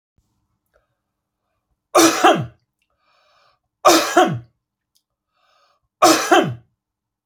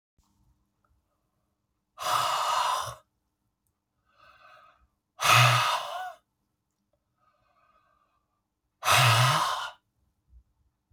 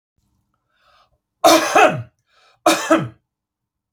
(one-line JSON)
{"three_cough_length": "7.3 s", "three_cough_amplitude": 30559, "three_cough_signal_mean_std_ratio": 0.34, "exhalation_length": "10.9 s", "exhalation_amplitude": 16784, "exhalation_signal_mean_std_ratio": 0.37, "cough_length": "3.9 s", "cough_amplitude": 32767, "cough_signal_mean_std_ratio": 0.36, "survey_phase": "beta (2021-08-13 to 2022-03-07)", "age": "45-64", "gender": "Male", "wearing_mask": "No", "symptom_none": true, "smoker_status": "Never smoked", "respiratory_condition_asthma": false, "respiratory_condition_other": false, "recruitment_source": "REACT", "submission_delay": "0 days", "covid_test_result": "Negative", "covid_test_method": "RT-qPCR"}